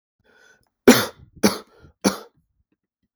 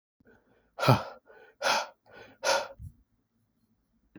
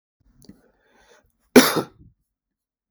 {"three_cough_length": "3.2 s", "three_cough_amplitude": 32768, "three_cough_signal_mean_std_ratio": 0.24, "exhalation_length": "4.2 s", "exhalation_amplitude": 19172, "exhalation_signal_mean_std_ratio": 0.32, "cough_length": "2.9 s", "cough_amplitude": 32768, "cough_signal_mean_std_ratio": 0.19, "survey_phase": "beta (2021-08-13 to 2022-03-07)", "age": "18-44", "gender": "Male", "wearing_mask": "No", "symptom_other": true, "smoker_status": "Ex-smoker", "respiratory_condition_asthma": false, "respiratory_condition_other": false, "recruitment_source": "Test and Trace", "submission_delay": "3 days", "covid_test_result": "Positive", "covid_test_method": "LFT"}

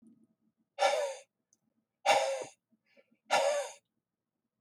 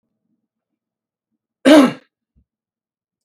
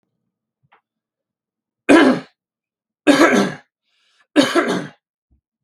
{"exhalation_length": "4.6 s", "exhalation_amplitude": 6856, "exhalation_signal_mean_std_ratio": 0.4, "cough_length": "3.2 s", "cough_amplitude": 32768, "cough_signal_mean_std_ratio": 0.22, "three_cough_length": "5.6 s", "three_cough_amplitude": 32768, "three_cough_signal_mean_std_ratio": 0.35, "survey_phase": "beta (2021-08-13 to 2022-03-07)", "age": "45-64", "gender": "Male", "wearing_mask": "No", "symptom_runny_or_blocked_nose": true, "symptom_onset": "12 days", "smoker_status": "Never smoked", "respiratory_condition_asthma": false, "respiratory_condition_other": false, "recruitment_source": "REACT", "submission_delay": "4 days", "covid_test_result": "Negative", "covid_test_method": "RT-qPCR", "influenza_a_test_result": "Negative", "influenza_b_test_result": "Negative"}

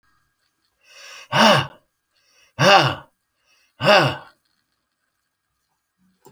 {"exhalation_length": "6.3 s", "exhalation_amplitude": 32767, "exhalation_signal_mean_std_ratio": 0.31, "survey_phase": "beta (2021-08-13 to 2022-03-07)", "age": "65+", "gender": "Male", "wearing_mask": "No", "symptom_none": true, "smoker_status": "Ex-smoker", "respiratory_condition_asthma": false, "respiratory_condition_other": false, "recruitment_source": "REACT", "submission_delay": "3 days", "covid_test_result": "Negative", "covid_test_method": "RT-qPCR"}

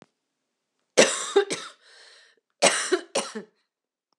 {"cough_length": "4.2 s", "cough_amplitude": 28796, "cough_signal_mean_std_ratio": 0.34, "survey_phase": "alpha (2021-03-01 to 2021-08-12)", "age": "18-44", "gender": "Female", "wearing_mask": "No", "symptom_cough_any": true, "symptom_fatigue": true, "symptom_headache": true, "symptom_change_to_sense_of_smell_or_taste": true, "symptom_onset": "2 days", "smoker_status": "Never smoked", "respiratory_condition_asthma": false, "respiratory_condition_other": false, "recruitment_source": "Test and Trace", "submission_delay": "2 days", "covid_test_result": "Positive", "covid_test_method": "RT-qPCR"}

